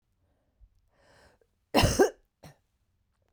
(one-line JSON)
{"cough_length": "3.3 s", "cough_amplitude": 12817, "cough_signal_mean_std_ratio": 0.25, "survey_phase": "beta (2021-08-13 to 2022-03-07)", "age": "18-44", "gender": "Female", "wearing_mask": "No", "symptom_cough_any": true, "symptom_new_continuous_cough": true, "symptom_shortness_of_breath": true, "symptom_sore_throat": true, "symptom_fatigue": true, "symptom_fever_high_temperature": true, "symptom_headache": true, "symptom_onset": "2 days", "smoker_status": "Ex-smoker", "respiratory_condition_asthma": true, "respiratory_condition_other": false, "recruitment_source": "Test and Trace", "submission_delay": "1 day", "covid_test_result": "Positive", "covid_test_method": "RT-qPCR", "covid_ct_value": 23.1, "covid_ct_gene": "N gene"}